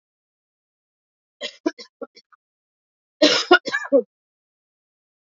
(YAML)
cough_length: 5.3 s
cough_amplitude: 28612
cough_signal_mean_std_ratio: 0.25
survey_phase: beta (2021-08-13 to 2022-03-07)
age: 45-64
gender: Female
wearing_mask: 'No'
symptom_cough_any: true
symptom_runny_or_blocked_nose: true
symptom_shortness_of_breath: true
symptom_sore_throat: true
symptom_abdominal_pain: true
symptom_fatigue: true
symptom_fever_high_temperature: true
symptom_headache: true
symptom_change_to_sense_of_smell_or_taste: true
symptom_other: true
smoker_status: Never smoked
respiratory_condition_asthma: false
respiratory_condition_other: false
recruitment_source: Test and Trace
submission_delay: 1 day
covid_test_result: Positive
covid_test_method: RT-qPCR
covid_ct_value: 26.7
covid_ct_gene: S gene
covid_ct_mean: 27.1
covid_viral_load: 1300 copies/ml
covid_viral_load_category: Minimal viral load (< 10K copies/ml)